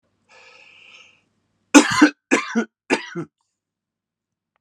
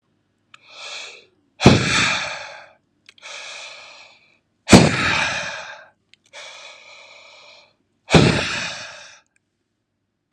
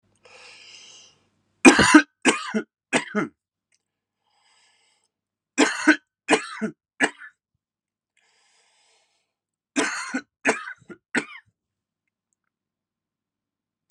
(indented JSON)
{
  "cough_length": "4.6 s",
  "cough_amplitude": 32768,
  "cough_signal_mean_std_ratio": 0.27,
  "exhalation_length": "10.3 s",
  "exhalation_amplitude": 32768,
  "exhalation_signal_mean_std_ratio": 0.34,
  "three_cough_length": "13.9 s",
  "three_cough_amplitude": 32768,
  "three_cough_signal_mean_std_ratio": 0.26,
  "survey_phase": "alpha (2021-03-01 to 2021-08-12)",
  "age": "45-64",
  "gender": "Male",
  "wearing_mask": "No",
  "symptom_none": true,
  "smoker_status": "Never smoked",
  "respiratory_condition_asthma": false,
  "respiratory_condition_other": false,
  "recruitment_source": "REACT",
  "submission_delay": "-1 day",
  "covid_test_result": "Negative",
  "covid_test_method": "RT-qPCR"
}